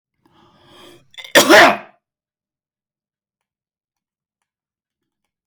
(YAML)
cough_length: 5.5 s
cough_amplitude: 32768
cough_signal_mean_std_ratio: 0.22
survey_phase: beta (2021-08-13 to 2022-03-07)
age: 45-64
gender: Male
wearing_mask: 'No'
symptom_none: true
smoker_status: Never smoked
respiratory_condition_asthma: false
respiratory_condition_other: false
recruitment_source: REACT
submission_delay: 4 days
covid_test_result: Negative
covid_test_method: RT-qPCR
influenza_a_test_result: Negative
influenza_b_test_result: Negative